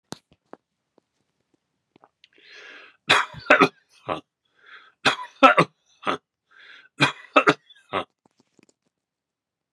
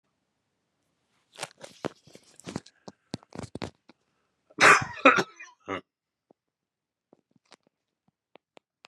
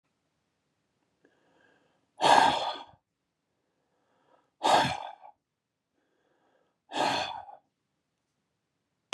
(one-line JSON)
{"three_cough_length": "9.7 s", "three_cough_amplitude": 32767, "three_cough_signal_mean_std_ratio": 0.25, "cough_length": "8.9 s", "cough_amplitude": 25320, "cough_signal_mean_std_ratio": 0.19, "exhalation_length": "9.1 s", "exhalation_amplitude": 16045, "exhalation_signal_mean_std_ratio": 0.28, "survey_phase": "beta (2021-08-13 to 2022-03-07)", "age": "65+", "gender": "Male", "wearing_mask": "No", "symptom_none": true, "smoker_status": "Ex-smoker", "respiratory_condition_asthma": false, "respiratory_condition_other": false, "recruitment_source": "REACT", "submission_delay": "2 days", "covid_test_result": "Negative", "covid_test_method": "RT-qPCR", "influenza_a_test_result": "Negative", "influenza_b_test_result": "Negative"}